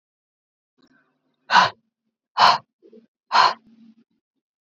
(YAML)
exhalation_length: 4.6 s
exhalation_amplitude: 28113
exhalation_signal_mean_std_ratio: 0.28
survey_phase: beta (2021-08-13 to 2022-03-07)
age: 45-64
gender: Female
wearing_mask: 'No'
symptom_none: true
smoker_status: Ex-smoker
respiratory_condition_asthma: false
respiratory_condition_other: false
recruitment_source: REACT
submission_delay: 2 days
covid_test_result: Negative
covid_test_method: RT-qPCR
influenza_a_test_result: Negative
influenza_b_test_result: Negative